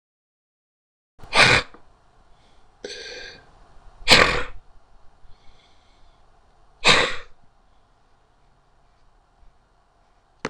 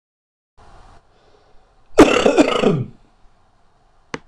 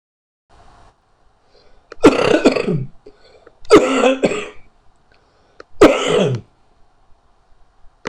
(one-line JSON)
{"exhalation_length": "10.5 s", "exhalation_amplitude": 26028, "exhalation_signal_mean_std_ratio": 0.28, "cough_length": "4.3 s", "cough_amplitude": 26028, "cough_signal_mean_std_ratio": 0.34, "three_cough_length": "8.1 s", "three_cough_amplitude": 26028, "three_cough_signal_mean_std_ratio": 0.39, "survey_phase": "beta (2021-08-13 to 2022-03-07)", "age": "45-64", "gender": "Male", "wearing_mask": "No", "symptom_shortness_of_breath": true, "symptom_diarrhoea": true, "symptom_fatigue": true, "symptom_headache": true, "symptom_onset": "3 days", "smoker_status": "Ex-smoker", "respiratory_condition_asthma": true, "respiratory_condition_other": true, "recruitment_source": "Test and Trace", "submission_delay": "1 day", "covid_test_result": "Positive", "covid_test_method": "RT-qPCR", "covid_ct_value": 31.9, "covid_ct_gene": "N gene"}